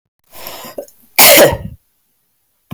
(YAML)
cough_length: 2.7 s
cough_amplitude: 32768
cough_signal_mean_std_ratio: 0.37
survey_phase: beta (2021-08-13 to 2022-03-07)
age: 45-64
gender: Female
wearing_mask: 'No'
symptom_cough_any: true
symptom_runny_or_blocked_nose: true
smoker_status: Ex-smoker
respiratory_condition_asthma: false
respiratory_condition_other: false
recruitment_source: Test and Trace
submission_delay: 1 day
covid_test_result: Positive
covid_test_method: RT-qPCR
covid_ct_value: 28.5
covid_ct_gene: ORF1ab gene
covid_ct_mean: 29.0
covid_viral_load: 310 copies/ml
covid_viral_load_category: Minimal viral load (< 10K copies/ml)